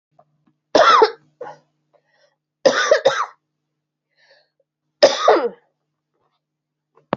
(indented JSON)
{
  "three_cough_length": "7.2 s",
  "three_cough_amplitude": 30486,
  "three_cough_signal_mean_std_ratio": 0.33,
  "survey_phase": "alpha (2021-03-01 to 2021-08-12)",
  "age": "45-64",
  "gender": "Female",
  "wearing_mask": "No",
  "symptom_cough_any": true,
  "symptom_fatigue": true,
  "symptom_headache": true,
  "symptom_change_to_sense_of_smell_or_taste": true,
  "symptom_loss_of_taste": true,
  "symptom_onset": "5 days",
  "smoker_status": "Ex-smoker",
  "respiratory_condition_asthma": false,
  "respiratory_condition_other": false,
  "recruitment_source": "Test and Trace",
  "submission_delay": "1 day",
  "covid_test_result": "Positive",
  "covid_test_method": "RT-qPCR"
}